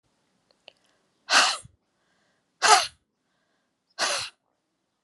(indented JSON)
{
  "exhalation_length": "5.0 s",
  "exhalation_amplitude": 24538,
  "exhalation_signal_mean_std_ratio": 0.28,
  "survey_phase": "alpha (2021-03-01 to 2021-08-12)",
  "age": "45-64",
  "gender": "Female",
  "wearing_mask": "No",
  "symptom_none": true,
  "smoker_status": "Never smoked",
  "respiratory_condition_asthma": false,
  "respiratory_condition_other": false,
  "recruitment_source": "REACT",
  "submission_delay": "3 days",
  "covid_test_result": "Negative",
  "covid_test_method": "RT-qPCR"
}